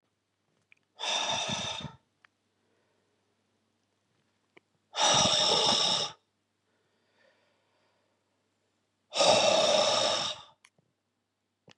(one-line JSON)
{"exhalation_length": "11.8 s", "exhalation_amplitude": 10529, "exhalation_signal_mean_std_ratio": 0.42, "survey_phase": "beta (2021-08-13 to 2022-03-07)", "age": "45-64", "gender": "Male", "wearing_mask": "No", "symptom_none": true, "smoker_status": "Ex-smoker", "respiratory_condition_asthma": false, "respiratory_condition_other": false, "recruitment_source": "REACT", "submission_delay": "1 day", "covid_test_result": "Negative", "covid_test_method": "RT-qPCR", "influenza_a_test_result": "Negative", "influenza_b_test_result": "Negative"}